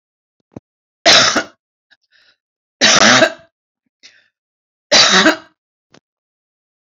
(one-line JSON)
{"three_cough_length": "6.8 s", "three_cough_amplitude": 32768, "three_cough_signal_mean_std_ratio": 0.36, "survey_phase": "beta (2021-08-13 to 2022-03-07)", "age": "65+", "gender": "Female", "wearing_mask": "No", "symptom_none": true, "smoker_status": "Current smoker (11 or more cigarettes per day)", "respiratory_condition_asthma": false, "respiratory_condition_other": false, "recruitment_source": "REACT", "submission_delay": "2 days", "covid_test_result": "Negative", "covid_test_method": "RT-qPCR", "influenza_a_test_result": "Negative", "influenza_b_test_result": "Negative"}